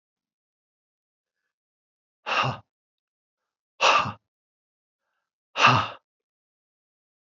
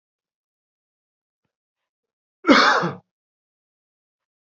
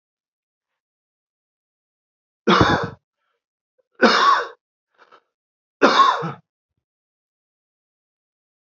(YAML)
exhalation_length: 7.3 s
exhalation_amplitude: 22564
exhalation_signal_mean_std_ratio: 0.25
cough_length: 4.4 s
cough_amplitude: 27718
cough_signal_mean_std_ratio: 0.24
three_cough_length: 8.7 s
three_cough_amplitude: 30075
three_cough_signal_mean_std_ratio: 0.3
survey_phase: beta (2021-08-13 to 2022-03-07)
age: 18-44
gender: Male
wearing_mask: 'No'
symptom_none: true
smoker_status: Never smoked
respiratory_condition_asthma: true
respiratory_condition_other: false
recruitment_source: Test and Trace
submission_delay: 0 days
covid_test_result: Negative
covid_test_method: LFT